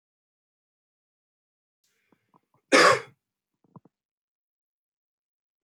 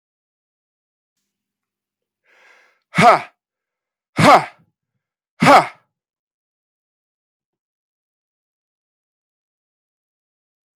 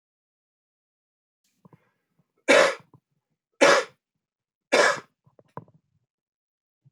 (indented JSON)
{
  "cough_length": "5.6 s",
  "cough_amplitude": 21801,
  "cough_signal_mean_std_ratio": 0.17,
  "exhalation_length": "10.8 s",
  "exhalation_amplitude": 32768,
  "exhalation_signal_mean_std_ratio": 0.2,
  "three_cough_length": "6.9 s",
  "three_cough_amplitude": 19950,
  "three_cough_signal_mean_std_ratio": 0.25,
  "survey_phase": "alpha (2021-03-01 to 2021-08-12)",
  "age": "45-64",
  "gender": "Male",
  "wearing_mask": "No",
  "symptom_cough_any": true,
  "symptom_headache": true,
  "symptom_change_to_sense_of_smell_or_taste": true,
  "symptom_loss_of_taste": true,
  "symptom_onset": "3 days",
  "smoker_status": "Never smoked",
  "respiratory_condition_asthma": false,
  "respiratory_condition_other": false,
  "recruitment_source": "Test and Trace",
  "submission_delay": "2 days",
  "covid_test_result": "Positive",
  "covid_test_method": "RT-qPCR",
  "covid_ct_value": 22.9,
  "covid_ct_gene": "ORF1ab gene",
  "covid_ct_mean": 23.4,
  "covid_viral_load": "20000 copies/ml",
  "covid_viral_load_category": "Low viral load (10K-1M copies/ml)"
}